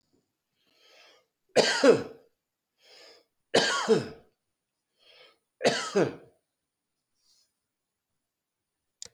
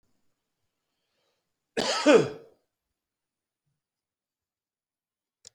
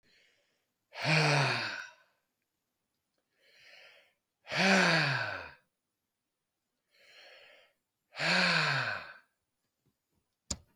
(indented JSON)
{
  "three_cough_length": "9.1 s",
  "three_cough_amplitude": 18032,
  "three_cough_signal_mean_std_ratio": 0.29,
  "cough_length": "5.5 s",
  "cough_amplitude": 14987,
  "cough_signal_mean_std_ratio": 0.2,
  "exhalation_length": "10.8 s",
  "exhalation_amplitude": 8036,
  "exhalation_signal_mean_std_ratio": 0.4,
  "survey_phase": "beta (2021-08-13 to 2022-03-07)",
  "age": "65+",
  "gender": "Male",
  "wearing_mask": "No",
  "symptom_none": true,
  "smoker_status": "Never smoked",
  "respiratory_condition_asthma": false,
  "respiratory_condition_other": false,
  "recruitment_source": "REACT",
  "submission_delay": "2 days",
  "covid_test_result": "Negative",
  "covid_test_method": "RT-qPCR",
  "influenza_a_test_result": "Negative",
  "influenza_b_test_result": "Negative"
}